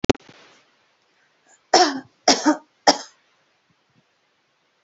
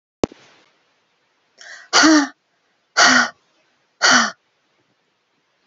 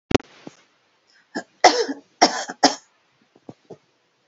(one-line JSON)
{"three_cough_length": "4.8 s", "three_cough_amplitude": 32767, "three_cough_signal_mean_std_ratio": 0.25, "exhalation_length": "5.7 s", "exhalation_amplitude": 32767, "exhalation_signal_mean_std_ratio": 0.34, "cough_length": "4.3 s", "cough_amplitude": 32767, "cough_signal_mean_std_ratio": 0.26, "survey_phase": "alpha (2021-03-01 to 2021-08-12)", "age": "45-64", "gender": "Female", "wearing_mask": "No", "symptom_none": true, "smoker_status": "Never smoked", "respiratory_condition_asthma": false, "respiratory_condition_other": false, "recruitment_source": "REACT", "submission_delay": "2 days", "covid_test_result": "Negative", "covid_test_method": "RT-qPCR"}